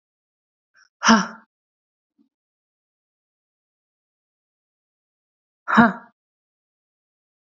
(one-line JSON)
{"exhalation_length": "7.5 s", "exhalation_amplitude": 28774, "exhalation_signal_mean_std_ratio": 0.18, "survey_phase": "alpha (2021-03-01 to 2021-08-12)", "age": "18-44", "gender": "Female", "wearing_mask": "No", "symptom_fatigue": true, "smoker_status": "Never smoked", "respiratory_condition_asthma": false, "respiratory_condition_other": false, "recruitment_source": "Test and Trace", "submission_delay": "1 day", "covid_test_result": "Positive", "covid_test_method": "LFT"}